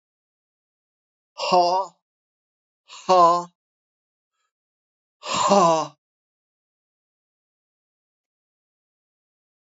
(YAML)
exhalation_length: 9.6 s
exhalation_amplitude: 21714
exhalation_signal_mean_std_ratio: 0.29
survey_phase: beta (2021-08-13 to 2022-03-07)
age: 65+
gender: Male
wearing_mask: 'No'
symptom_cough_any: true
symptom_shortness_of_breath: true
symptom_change_to_sense_of_smell_or_taste: true
symptom_onset: 9 days
smoker_status: Never smoked
respiratory_condition_asthma: false
respiratory_condition_other: false
recruitment_source: Test and Trace
submission_delay: 2 days
covid_test_result: Positive
covid_test_method: RT-qPCR
covid_ct_value: 13.5
covid_ct_gene: S gene
covid_ct_mean: 14.3
covid_viral_load: 20000000 copies/ml
covid_viral_load_category: High viral load (>1M copies/ml)